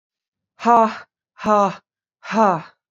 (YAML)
exhalation_length: 2.9 s
exhalation_amplitude: 27454
exhalation_signal_mean_std_ratio: 0.41
survey_phase: beta (2021-08-13 to 2022-03-07)
age: 18-44
gender: Female
wearing_mask: 'No'
symptom_cough_any: true
symptom_new_continuous_cough: true
symptom_runny_or_blocked_nose: true
symptom_sore_throat: true
symptom_onset: 3 days
smoker_status: Never smoked
respiratory_condition_asthma: false
respiratory_condition_other: false
recruitment_source: Test and Trace
submission_delay: 1 day
covid_test_result: Positive
covid_test_method: RT-qPCR
covid_ct_value: 22.5
covid_ct_gene: ORF1ab gene
covid_ct_mean: 22.7
covid_viral_load: 36000 copies/ml
covid_viral_load_category: Low viral load (10K-1M copies/ml)